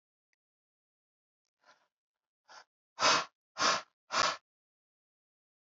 exhalation_length: 5.7 s
exhalation_amplitude: 6483
exhalation_signal_mean_std_ratio: 0.27
survey_phase: alpha (2021-03-01 to 2021-08-12)
age: 45-64
gender: Male
wearing_mask: 'No'
symptom_none: true
smoker_status: Ex-smoker
respiratory_condition_asthma: false
respiratory_condition_other: false
recruitment_source: REACT
submission_delay: 2 days
covid_test_result: Negative
covid_test_method: RT-qPCR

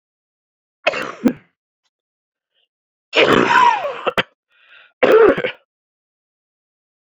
three_cough_length: 7.2 s
three_cough_amplitude: 30178
three_cough_signal_mean_std_ratio: 0.36
survey_phase: beta (2021-08-13 to 2022-03-07)
age: 18-44
gender: Male
wearing_mask: 'Yes'
symptom_cough_any: true
symptom_new_continuous_cough: true
symptom_runny_or_blocked_nose: true
symptom_shortness_of_breath: true
symptom_fever_high_temperature: true
symptom_headache: true
symptom_change_to_sense_of_smell_or_taste: true
symptom_loss_of_taste: true
symptom_onset: 4 days
smoker_status: Never smoked
respiratory_condition_asthma: false
respiratory_condition_other: false
recruitment_source: Test and Trace
submission_delay: 2 days
covid_test_result: Positive
covid_test_method: RT-qPCR
covid_ct_value: 16.6
covid_ct_gene: ORF1ab gene
covid_ct_mean: 17.0
covid_viral_load: 2600000 copies/ml
covid_viral_load_category: High viral load (>1M copies/ml)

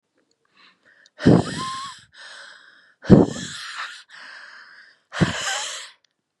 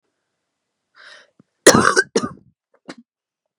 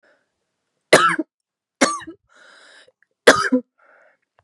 exhalation_length: 6.4 s
exhalation_amplitude: 32767
exhalation_signal_mean_std_ratio: 0.32
cough_length: 3.6 s
cough_amplitude: 32768
cough_signal_mean_std_ratio: 0.25
three_cough_length: 4.4 s
three_cough_amplitude: 32768
three_cough_signal_mean_std_ratio: 0.28
survey_phase: beta (2021-08-13 to 2022-03-07)
age: 18-44
gender: Female
wearing_mask: 'No'
symptom_cough_any: true
symptom_runny_or_blocked_nose: true
symptom_sore_throat: true
symptom_diarrhoea: true
symptom_fatigue: true
symptom_change_to_sense_of_smell_or_taste: true
symptom_loss_of_taste: true
smoker_status: Never smoked
respiratory_condition_asthma: false
respiratory_condition_other: false
recruitment_source: Test and Trace
submission_delay: -2 days
covid_test_result: Negative
covid_test_method: ePCR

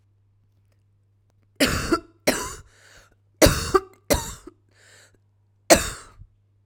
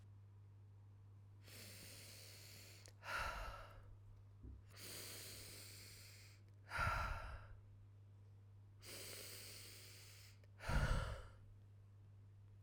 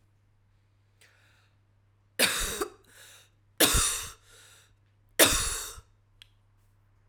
cough_length: 6.7 s
cough_amplitude: 32768
cough_signal_mean_std_ratio: 0.3
exhalation_length: 12.6 s
exhalation_amplitude: 1523
exhalation_signal_mean_std_ratio: 0.58
three_cough_length: 7.1 s
three_cough_amplitude: 25041
three_cough_signal_mean_std_ratio: 0.33
survey_phase: alpha (2021-03-01 to 2021-08-12)
age: 45-64
gender: Female
wearing_mask: 'No'
symptom_shortness_of_breath: true
symptom_fatigue: true
symptom_headache: true
symptom_change_to_sense_of_smell_or_taste: true
symptom_onset: 3 days
smoker_status: Ex-smoker
respiratory_condition_asthma: false
respiratory_condition_other: false
recruitment_source: Test and Trace
submission_delay: 2 days
covid_test_result: Positive
covid_test_method: RT-qPCR
covid_ct_value: 15.9
covid_ct_gene: ORF1ab gene
covid_ct_mean: 16.3
covid_viral_load: 4400000 copies/ml
covid_viral_load_category: High viral load (>1M copies/ml)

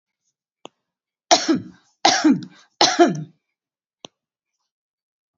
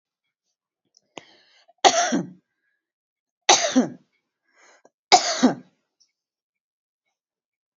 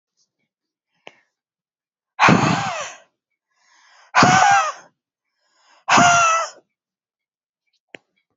three_cough_length: 5.4 s
three_cough_amplitude: 29756
three_cough_signal_mean_std_ratio: 0.32
cough_length: 7.8 s
cough_amplitude: 32767
cough_signal_mean_std_ratio: 0.27
exhalation_length: 8.4 s
exhalation_amplitude: 31497
exhalation_signal_mean_std_ratio: 0.37
survey_phase: beta (2021-08-13 to 2022-03-07)
age: 45-64
gender: Female
wearing_mask: 'No'
symptom_headache: true
smoker_status: Never smoked
respiratory_condition_asthma: false
respiratory_condition_other: false
recruitment_source: REACT
submission_delay: 11 days
covid_test_result: Negative
covid_test_method: RT-qPCR
influenza_a_test_result: Negative
influenza_b_test_result: Negative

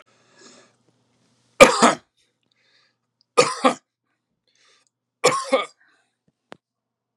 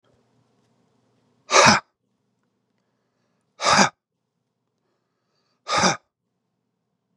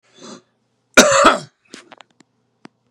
three_cough_length: 7.2 s
three_cough_amplitude: 32768
three_cough_signal_mean_std_ratio: 0.23
exhalation_length: 7.2 s
exhalation_amplitude: 32768
exhalation_signal_mean_std_ratio: 0.25
cough_length: 2.9 s
cough_amplitude: 32768
cough_signal_mean_std_ratio: 0.3
survey_phase: beta (2021-08-13 to 2022-03-07)
age: 45-64
gender: Male
wearing_mask: 'No'
symptom_none: true
smoker_status: Ex-smoker
respiratory_condition_asthma: false
respiratory_condition_other: false
recruitment_source: REACT
submission_delay: 1 day
covid_test_result: Negative
covid_test_method: RT-qPCR
influenza_a_test_result: Negative
influenza_b_test_result: Negative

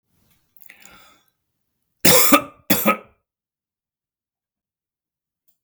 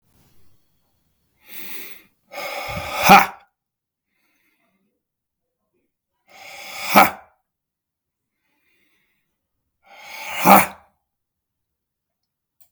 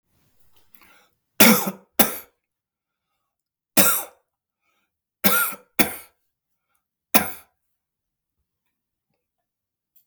cough_length: 5.6 s
cough_amplitude: 32766
cough_signal_mean_std_ratio: 0.25
exhalation_length: 12.7 s
exhalation_amplitude: 32768
exhalation_signal_mean_std_ratio: 0.23
three_cough_length: 10.1 s
three_cough_amplitude: 32768
three_cough_signal_mean_std_ratio: 0.25
survey_phase: beta (2021-08-13 to 2022-03-07)
age: 45-64
gender: Male
wearing_mask: 'No'
symptom_prefer_not_to_say: true
smoker_status: Never smoked
respiratory_condition_asthma: false
respiratory_condition_other: false
recruitment_source: REACT
submission_delay: 0 days
covid_test_result: Negative
covid_test_method: RT-qPCR
influenza_a_test_result: Negative
influenza_b_test_result: Negative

